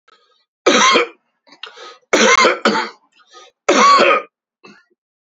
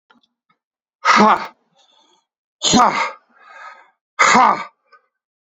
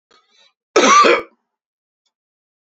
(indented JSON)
{
  "three_cough_length": "5.3 s",
  "three_cough_amplitude": 31586,
  "three_cough_signal_mean_std_ratio": 0.48,
  "exhalation_length": "5.5 s",
  "exhalation_amplitude": 29169,
  "exhalation_signal_mean_std_ratio": 0.38,
  "cough_length": "2.6 s",
  "cough_amplitude": 29919,
  "cough_signal_mean_std_ratio": 0.35,
  "survey_phase": "beta (2021-08-13 to 2022-03-07)",
  "age": "45-64",
  "gender": "Male",
  "wearing_mask": "No",
  "symptom_cough_any": true,
  "symptom_runny_or_blocked_nose": true,
  "symptom_change_to_sense_of_smell_or_taste": true,
  "smoker_status": "Ex-smoker",
  "respiratory_condition_asthma": false,
  "respiratory_condition_other": false,
  "recruitment_source": "Test and Trace",
  "submission_delay": "2 days",
  "covid_test_result": "Positive",
  "covid_test_method": "LFT"
}